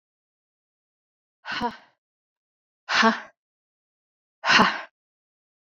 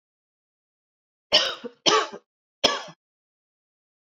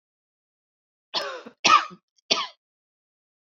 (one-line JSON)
{"exhalation_length": "5.7 s", "exhalation_amplitude": 24304, "exhalation_signal_mean_std_ratio": 0.27, "three_cough_length": "4.2 s", "three_cough_amplitude": 24496, "three_cough_signal_mean_std_ratio": 0.28, "cough_length": "3.6 s", "cough_amplitude": 20356, "cough_signal_mean_std_ratio": 0.26, "survey_phase": "beta (2021-08-13 to 2022-03-07)", "age": "45-64", "gender": "Female", "wearing_mask": "No", "symptom_cough_any": true, "symptom_runny_or_blocked_nose": true, "symptom_abdominal_pain": true, "symptom_fatigue": true, "symptom_headache": true, "smoker_status": "Never smoked", "respiratory_condition_asthma": false, "respiratory_condition_other": false, "recruitment_source": "Test and Trace", "submission_delay": "1 day", "covid_test_result": "Positive", "covid_test_method": "RT-qPCR", "covid_ct_value": 28.9, "covid_ct_gene": "ORF1ab gene"}